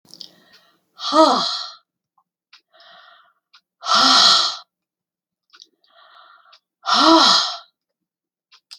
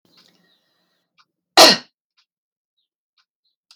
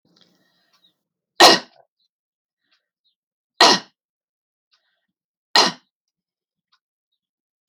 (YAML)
exhalation_length: 8.8 s
exhalation_amplitude: 29217
exhalation_signal_mean_std_ratio: 0.38
cough_length: 3.8 s
cough_amplitude: 32767
cough_signal_mean_std_ratio: 0.18
three_cough_length: 7.7 s
three_cough_amplitude: 32768
three_cough_signal_mean_std_ratio: 0.19
survey_phase: alpha (2021-03-01 to 2021-08-12)
age: 65+
gender: Female
wearing_mask: 'No'
symptom_none: true
smoker_status: Never smoked
respiratory_condition_asthma: false
respiratory_condition_other: false
recruitment_source: REACT
submission_delay: 2 days
covid_test_result: Negative
covid_test_method: RT-qPCR